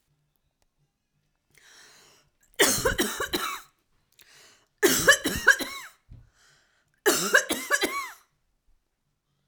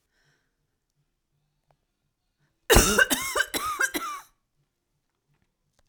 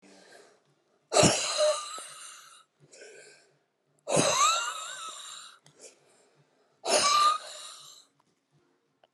{
  "three_cough_length": "9.5 s",
  "three_cough_amplitude": 18563,
  "three_cough_signal_mean_std_ratio": 0.36,
  "cough_length": "5.9 s",
  "cough_amplitude": 27176,
  "cough_signal_mean_std_ratio": 0.3,
  "exhalation_length": "9.1 s",
  "exhalation_amplitude": 14454,
  "exhalation_signal_mean_std_ratio": 0.42,
  "survey_phase": "alpha (2021-03-01 to 2021-08-12)",
  "age": "65+",
  "gender": "Female",
  "wearing_mask": "No",
  "symptom_none": true,
  "smoker_status": "Never smoked",
  "respiratory_condition_asthma": false,
  "respiratory_condition_other": false,
  "recruitment_source": "REACT",
  "submission_delay": "1 day",
  "covid_test_result": "Negative",
  "covid_test_method": "RT-qPCR"
}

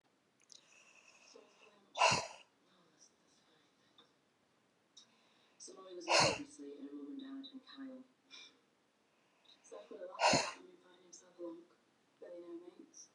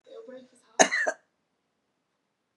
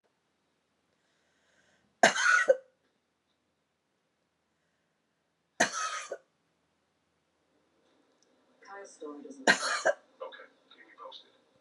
{
  "exhalation_length": "13.1 s",
  "exhalation_amplitude": 5404,
  "exhalation_signal_mean_std_ratio": 0.31,
  "cough_length": "2.6 s",
  "cough_amplitude": 28341,
  "cough_signal_mean_std_ratio": 0.25,
  "three_cough_length": "11.6 s",
  "three_cough_amplitude": 15359,
  "three_cough_signal_mean_std_ratio": 0.25,
  "survey_phase": "beta (2021-08-13 to 2022-03-07)",
  "age": "65+",
  "gender": "Female",
  "wearing_mask": "No",
  "symptom_none": true,
  "smoker_status": "Ex-smoker",
  "respiratory_condition_asthma": false,
  "respiratory_condition_other": true,
  "recruitment_source": "REACT",
  "submission_delay": "2 days",
  "covid_test_result": "Negative",
  "covid_test_method": "RT-qPCR",
  "influenza_a_test_result": "Negative",
  "influenza_b_test_result": "Negative"
}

